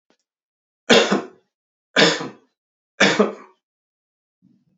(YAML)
three_cough_length: 4.8 s
three_cough_amplitude: 29017
three_cough_signal_mean_std_ratio: 0.32
survey_phase: beta (2021-08-13 to 2022-03-07)
age: 45-64
gender: Male
wearing_mask: 'No'
symptom_none: true
smoker_status: Never smoked
respiratory_condition_asthma: false
respiratory_condition_other: false
recruitment_source: REACT
submission_delay: 2 days
covid_test_result: Negative
covid_test_method: RT-qPCR
influenza_a_test_result: Negative
influenza_b_test_result: Negative